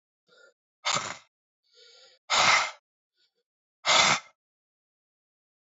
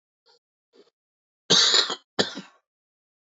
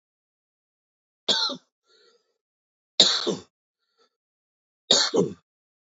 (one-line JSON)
{"exhalation_length": "5.6 s", "exhalation_amplitude": 13622, "exhalation_signal_mean_std_ratio": 0.32, "cough_length": "3.2 s", "cough_amplitude": 18920, "cough_signal_mean_std_ratio": 0.31, "three_cough_length": "5.9 s", "three_cough_amplitude": 30300, "three_cough_signal_mean_std_ratio": 0.29, "survey_phase": "beta (2021-08-13 to 2022-03-07)", "age": "45-64", "gender": "Male", "wearing_mask": "No", "symptom_cough_any": true, "symptom_runny_or_blocked_nose": true, "symptom_sore_throat": true, "symptom_diarrhoea": true, "symptom_fatigue": true, "symptom_fever_high_temperature": true, "symptom_headache": true, "symptom_change_to_sense_of_smell_or_taste": true, "symptom_loss_of_taste": true, "symptom_onset": "2 days", "smoker_status": "Never smoked", "respiratory_condition_asthma": false, "respiratory_condition_other": false, "recruitment_source": "Test and Trace", "submission_delay": "1 day", "covid_test_result": "Positive", "covid_test_method": "RT-qPCR", "covid_ct_value": 19.5, "covid_ct_gene": "N gene"}